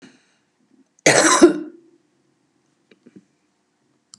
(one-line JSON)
{"cough_length": "4.2 s", "cough_amplitude": 32768, "cough_signal_mean_std_ratio": 0.27, "survey_phase": "beta (2021-08-13 to 2022-03-07)", "age": "65+", "gender": "Female", "wearing_mask": "No", "symptom_cough_any": true, "symptom_runny_or_blocked_nose": true, "symptom_sore_throat": true, "symptom_onset": "2 days", "smoker_status": "Never smoked", "respiratory_condition_asthma": false, "respiratory_condition_other": false, "recruitment_source": "Test and Trace", "submission_delay": "1 day", "covid_test_result": "Negative", "covid_test_method": "ePCR"}